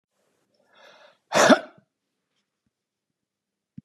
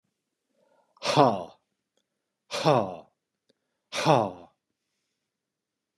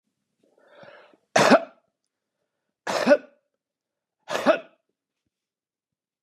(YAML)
cough_length: 3.8 s
cough_amplitude: 26538
cough_signal_mean_std_ratio: 0.2
exhalation_length: 6.0 s
exhalation_amplitude: 18425
exhalation_signal_mean_std_ratio: 0.29
three_cough_length: 6.2 s
three_cough_amplitude: 28349
three_cough_signal_mean_std_ratio: 0.26
survey_phase: beta (2021-08-13 to 2022-03-07)
age: 65+
gender: Male
wearing_mask: 'No'
symptom_none: true
smoker_status: Never smoked
respiratory_condition_asthma: false
respiratory_condition_other: false
recruitment_source: Test and Trace
submission_delay: 2 days
covid_test_result: Negative
covid_test_method: ePCR